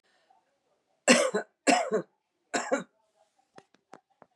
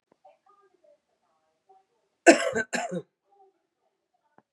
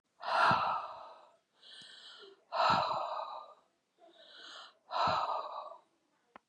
{
  "three_cough_length": "4.4 s",
  "three_cough_amplitude": 19303,
  "three_cough_signal_mean_std_ratio": 0.32,
  "cough_length": "4.5 s",
  "cough_amplitude": 26979,
  "cough_signal_mean_std_ratio": 0.21,
  "exhalation_length": "6.5 s",
  "exhalation_amplitude": 5053,
  "exhalation_signal_mean_std_ratio": 0.5,
  "survey_phase": "beta (2021-08-13 to 2022-03-07)",
  "age": "65+",
  "gender": "Female",
  "wearing_mask": "No",
  "symptom_none": true,
  "symptom_onset": "9 days",
  "smoker_status": "Ex-smoker",
  "respiratory_condition_asthma": false,
  "respiratory_condition_other": false,
  "recruitment_source": "REACT",
  "submission_delay": "1 day",
  "covid_test_result": "Positive",
  "covid_test_method": "RT-qPCR",
  "covid_ct_value": 23.0,
  "covid_ct_gene": "E gene",
  "influenza_a_test_result": "Negative",
  "influenza_b_test_result": "Negative"
}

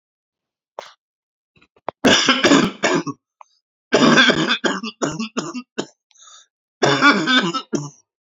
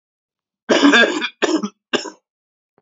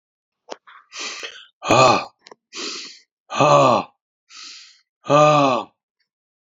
{
  "three_cough_length": "8.4 s",
  "three_cough_amplitude": 29047,
  "three_cough_signal_mean_std_ratio": 0.47,
  "cough_length": "2.8 s",
  "cough_amplitude": 29375,
  "cough_signal_mean_std_ratio": 0.44,
  "exhalation_length": "6.6 s",
  "exhalation_amplitude": 29074,
  "exhalation_signal_mean_std_ratio": 0.4,
  "survey_phase": "beta (2021-08-13 to 2022-03-07)",
  "age": "45-64",
  "gender": "Male",
  "wearing_mask": "No",
  "symptom_cough_any": true,
  "symptom_new_continuous_cough": true,
  "symptom_runny_or_blocked_nose": true,
  "symptom_sore_throat": true,
  "symptom_fever_high_temperature": true,
  "symptom_onset": "5 days",
  "smoker_status": "Ex-smoker",
  "respiratory_condition_asthma": false,
  "respiratory_condition_other": false,
  "recruitment_source": "Test and Trace",
  "submission_delay": "2 days",
  "covid_test_result": "Positive",
  "covid_test_method": "ePCR"
}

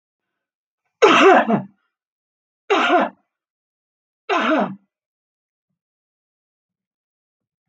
{
  "three_cough_length": "7.7 s",
  "three_cough_amplitude": 32531,
  "three_cough_signal_mean_std_ratio": 0.33,
  "survey_phase": "beta (2021-08-13 to 2022-03-07)",
  "age": "65+",
  "gender": "Female",
  "wearing_mask": "No",
  "symptom_cough_any": true,
  "smoker_status": "Ex-smoker",
  "respiratory_condition_asthma": false,
  "respiratory_condition_other": false,
  "recruitment_source": "REACT",
  "submission_delay": "1 day",
  "covid_test_result": "Negative",
  "covid_test_method": "RT-qPCR",
  "influenza_a_test_result": "Negative",
  "influenza_b_test_result": "Negative"
}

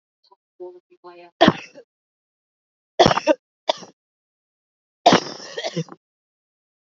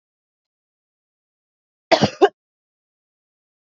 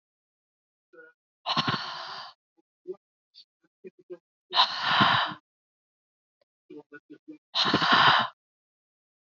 {
  "three_cough_length": "6.9 s",
  "three_cough_amplitude": 31068,
  "three_cough_signal_mean_std_ratio": 0.25,
  "cough_length": "3.7 s",
  "cough_amplitude": 28985,
  "cough_signal_mean_std_ratio": 0.18,
  "exhalation_length": "9.3 s",
  "exhalation_amplitude": 15097,
  "exhalation_signal_mean_std_ratio": 0.36,
  "survey_phase": "alpha (2021-03-01 to 2021-08-12)",
  "age": "18-44",
  "gender": "Female",
  "wearing_mask": "No",
  "symptom_cough_any": true,
  "symptom_abdominal_pain": true,
  "symptom_diarrhoea": true,
  "symptom_headache": true,
  "symptom_change_to_sense_of_smell_or_taste": true,
  "symptom_loss_of_taste": true,
  "smoker_status": "Never smoked",
  "respiratory_condition_asthma": false,
  "respiratory_condition_other": false,
  "recruitment_source": "Test and Trace",
  "submission_delay": "1 day",
  "covid_test_result": "Positive",
  "covid_test_method": "RT-qPCR",
  "covid_ct_value": 19.5,
  "covid_ct_gene": "N gene",
  "covid_ct_mean": 19.7,
  "covid_viral_load": "340000 copies/ml",
  "covid_viral_load_category": "Low viral load (10K-1M copies/ml)"
}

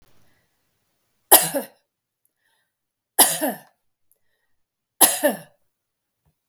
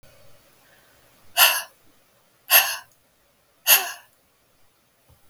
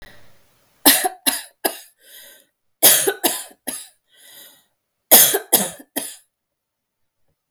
{
  "three_cough_length": "6.5 s",
  "three_cough_amplitude": 32768,
  "three_cough_signal_mean_std_ratio": 0.24,
  "exhalation_length": "5.3 s",
  "exhalation_amplitude": 32768,
  "exhalation_signal_mean_std_ratio": 0.27,
  "cough_length": "7.5 s",
  "cough_amplitude": 32768,
  "cough_signal_mean_std_ratio": 0.32,
  "survey_phase": "beta (2021-08-13 to 2022-03-07)",
  "age": "65+",
  "gender": "Female",
  "wearing_mask": "No",
  "symptom_none": true,
  "smoker_status": "Never smoked",
  "respiratory_condition_asthma": false,
  "respiratory_condition_other": false,
  "recruitment_source": "REACT",
  "submission_delay": "1 day",
  "covid_test_result": "Negative",
  "covid_test_method": "RT-qPCR"
}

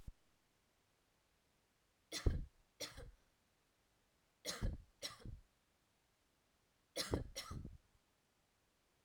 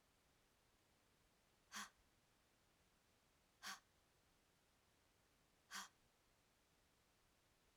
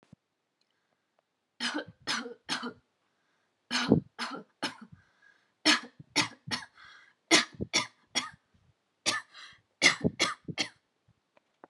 {
  "three_cough_length": "9.0 s",
  "three_cough_amplitude": 2644,
  "three_cough_signal_mean_std_ratio": 0.31,
  "exhalation_length": "7.8 s",
  "exhalation_amplitude": 419,
  "exhalation_signal_mean_std_ratio": 0.34,
  "cough_length": "11.7 s",
  "cough_amplitude": 18912,
  "cough_signal_mean_std_ratio": 0.33,
  "survey_phase": "alpha (2021-03-01 to 2021-08-12)",
  "age": "18-44",
  "gender": "Female",
  "wearing_mask": "No",
  "symptom_none": true,
  "symptom_onset": "2 days",
  "smoker_status": "Ex-smoker",
  "respiratory_condition_asthma": false,
  "respiratory_condition_other": false,
  "recruitment_source": "REACT",
  "submission_delay": "5 days",
  "covid_test_result": "Negative",
  "covid_test_method": "RT-qPCR"
}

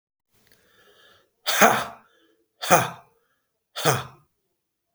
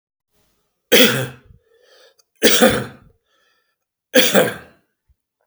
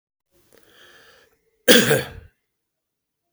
{
  "exhalation_length": "4.9 s",
  "exhalation_amplitude": 32768,
  "exhalation_signal_mean_std_ratio": 0.3,
  "three_cough_length": "5.5 s",
  "three_cough_amplitude": 32768,
  "three_cough_signal_mean_std_ratio": 0.35,
  "cough_length": "3.3 s",
  "cough_amplitude": 32768,
  "cough_signal_mean_std_ratio": 0.25,
  "survey_phase": "beta (2021-08-13 to 2022-03-07)",
  "age": "65+",
  "gender": "Male",
  "wearing_mask": "No",
  "symptom_none": true,
  "smoker_status": "Never smoked",
  "respiratory_condition_asthma": false,
  "respiratory_condition_other": false,
  "recruitment_source": "REACT",
  "submission_delay": "3 days",
  "covid_test_result": "Negative",
  "covid_test_method": "RT-qPCR",
  "influenza_a_test_result": "Negative",
  "influenza_b_test_result": "Negative"
}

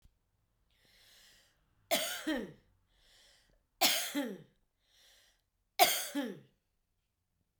{
  "three_cough_length": "7.6 s",
  "three_cough_amplitude": 10940,
  "three_cough_signal_mean_std_ratio": 0.32,
  "survey_phase": "beta (2021-08-13 to 2022-03-07)",
  "age": "45-64",
  "gender": "Female",
  "wearing_mask": "No",
  "symptom_none": true,
  "smoker_status": "Never smoked",
  "respiratory_condition_asthma": false,
  "respiratory_condition_other": false,
  "recruitment_source": "REACT",
  "submission_delay": "2 days",
  "covid_test_result": "Negative",
  "covid_test_method": "RT-qPCR"
}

